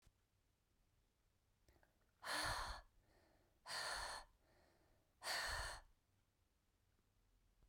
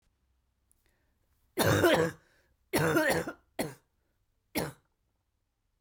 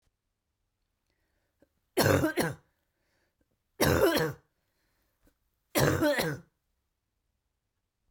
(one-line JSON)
{"exhalation_length": "7.7 s", "exhalation_amplitude": 825, "exhalation_signal_mean_std_ratio": 0.42, "cough_length": "5.8 s", "cough_amplitude": 8857, "cough_signal_mean_std_ratio": 0.38, "three_cough_length": "8.1 s", "three_cough_amplitude": 9795, "three_cough_signal_mean_std_ratio": 0.36, "survey_phase": "beta (2021-08-13 to 2022-03-07)", "age": "18-44", "gender": "Female", "wearing_mask": "No", "symptom_cough_any": true, "symptom_new_continuous_cough": true, "symptom_sore_throat": true, "symptom_fatigue": true, "symptom_headache": true, "symptom_change_to_sense_of_smell_or_taste": true, "symptom_onset": "6 days", "smoker_status": "Never smoked", "respiratory_condition_asthma": false, "respiratory_condition_other": false, "recruitment_source": "Test and Trace", "submission_delay": "2 days", "covid_test_result": "Positive", "covid_test_method": "RT-qPCR", "covid_ct_value": 17.8, "covid_ct_gene": "ORF1ab gene", "covid_ct_mean": 18.4, "covid_viral_load": "900000 copies/ml", "covid_viral_load_category": "Low viral load (10K-1M copies/ml)"}